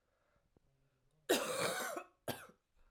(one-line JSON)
{"cough_length": "2.9 s", "cough_amplitude": 3595, "cough_signal_mean_std_ratio": 0.42, "survey_phase": "alpha (2021-03-01 to 2021-08-12)", "age": "18-44", "gender": "Female", "wearing_mask": "No", "symptom_cough_any": true, "symptom_new_continuous_cough": true, "symptom_fatigue": true, "symptom_fever_high_temperature": true, "symptom_headache": true, "symptom_change_to_sense_of_smell_or_taste": true, "symptom_onset": "2 days", "smoker_status": "Ex-smoker", "respiratory_condition_asthma": false, "respiratory_condition_other": false, "recruitment_source": "Test and Trace", "submission_delay": "1 day", "covid_test_result": "Positive", "covid_test_method": "RT-qPCR"}